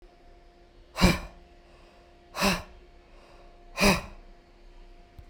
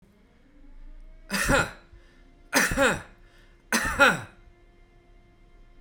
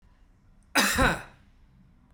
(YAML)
exhalation_length: 5.3 s
exhalation_amplitude: 18663
exhalation_signal_mean_std_ratio: 0.33
three_cough_length: 5.8 s
three_cough_amplitude: 16635
three_cough_signal_mean_std_ratio: 0.4
cough_length: 2.1 s
cough_amplitude: 14191
cough_signal_mean_std_ratio: 0.38
survey_phase: beta (2021-08-13 to 2022-03-07)
age: 45-64
gender: Male
wearing_mask: 'No'
symptom_none: true
smoker_status: Ex-smoker
respiratory_condition_asthma: false
respiratory_condition_other: false
recruitment_source: REACT
submission_delay: 3 days
covid_test_result: Negative
covid_test_method: RT-qPCR
influenza_a_test_result: Negative
influenza_b_test_result: Negative